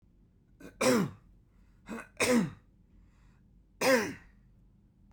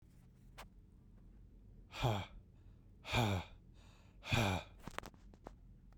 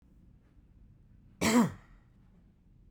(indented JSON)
{
  "three_cough_length": "5.1 s",
  "three_cough_amplitude": 6924,
  "three_cough_signal_mean_std_ratio": 0.38,
  "exhalation_length": "6.0 s",
  "exhalation_amplitude": 3035,
  "exhalation_signal_mean_std_ratio": 0.44,
  "cough_length": "2.9 s",
  "cough_amplitude": 7652,
  "cough_signal_mean_std_ratio": 0.3,
  "survey_phase": "beta (2021-08-13 to 2022-03-07)",
  "age": "45-64",
  "gender": "Male",
  "wearing_mask": "No",
  "symptom_none": true,
  "smoker_status": "Ex-smoker",
  "respiratory_condition_asthma": false,
  "respiratory_condition_other": false,
  "recruitment_source": "REACT",
  "submission_delay": "0 days",
  "covid_test_result": "Negative",
  "covid_test_method": "RT-qPCR"
}